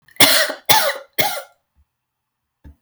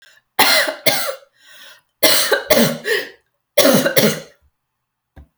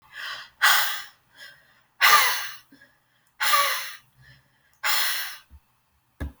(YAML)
cough_length: 2.8 s
cough_amplitude: 32768
cough_signal_mean_std_ratio: 0.4
three_cough_length: 5.4 s
three_cough_amplitude: 32768
three_cough_signal_mean_std_ratio: 0.5
exhalation_length: 6.4 s
exhalation_amplitude: 23577
exhalation_signal_mean_std_ratio: 0.44
survey_phase: alpha (2021-03-01 to 2021-08-12)
age: 18-44
gender: Female
wearing_mask: 'No'
symptom_none: true
smoker_status: Never smoked
respiratory_condition_asthma: false
respiratory_condition_other: false
recruitment_source: REACT
submission_delay: 2 days
covid_test_result: Negative
covid_test_method: RT-qPCR